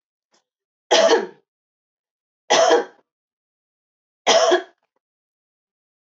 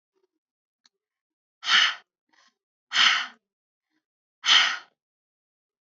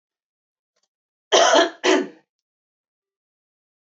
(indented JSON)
{
  "three_cough_length": "6.1 s",
  "three_cough_amplitude": 25511,
  "three_cough_signal_mean_std_ratio": 0.34,
  "exhalation_length": "5.8 s",
  "exhalation_amplitude": 20318,
  "exhalation_signal_mean_std_ratio": 0.3,
  "cough_length": "3.8 s",
  "cough_amplitude": 24227,
  "cough_signal_mean_std_ratio": 0.31,
  "survey_phase": "beta (2021-08-13 to 2022-03-07)",
  "age": "45-64",
  "gender": "Female",
  "wearing_mask": "No",
  "symptom_none": true,
  "smoker_status": "Never smoked",
  "respiratory_condition_asthma": false,
  "respiratory_condition_other": false,
  "recruitment_source": "REACT",
  "submission_delay": "6 days",
  "covid_test_result": "Negative",
  "covid_test_method": "RT-qPCR"
}